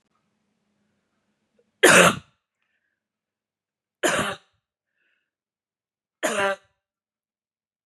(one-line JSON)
{"three_cough_length": "7.9 s", "three_cough_amplitude": 29121, "three_cough_signal_mean_std_ratio": 0.23, "survey_phase": "beta (2021-08-13 to 2022-03-07)", "age": "45-64", "gender": "Female", "wearing_mask": "No", "symptom_none": true, "smoker_status": "Never smoked", "respiratory_condition_asthma": false, "respiratory_condition_other": false, "recruitment_source": "REACT", "submission_delay": "2 days", "covid_test_result": "Negative", "covid_test_method": "RT-qPCR", "influenza_a_test_result": "Negative", "influenza_b_test_result": "Negative"}